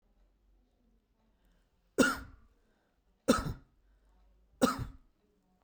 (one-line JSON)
{"three_cough_length": "5.6 s", "three_cough_amplitude": 9137, "three_cough_signal_mean_std_ratio": 0.25, "survey_phase": "beta (2021-08-13 to 2022-03-07)", "age": "18-44", "gender": "Male", "wearing_mask": "No", "symptom_none": true, "smoker_status": "Ex-smoker", "respiratory_condition_asthma": false, "respiratory_condition_other": false, "recruitment_source": "REACT", "submission_delay": "1 day", "covid_test_result": "Negative", "covid_test_method": "RT-qPCR"}